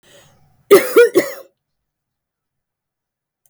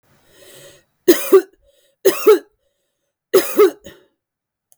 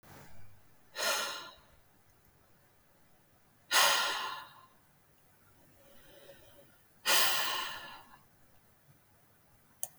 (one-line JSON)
{"cough_length": "3.5 s", "cough_amplitude": 32768, "cough_signal_mean_std_ratio": 0.28, "three_cough_length": "4.8 s", "three_cough_amplitude": 32768, "three_cough_signal_mean_std_ratio": 0.33, "exhalation_length": "10.0 s", "exhalation_amplitude": 8134, "exhalation_signal_mean_std_ratio": 0.37, "survey_phase": "beta (2021-08-13 to 2022-03-07)", "age": "45-64", "gender": "Female", "wearing_mask": "No", "symptom_fatigue": true, "smoker_status": "Never smoked", "respiratory_condition_asthma": false, "respiratory_condition_other": false, "recruitment_source": "Test and Trace", "submission_delay": "1 day", "covid_test_result": "Negative", "covid_test_method": "RT-qPCR"}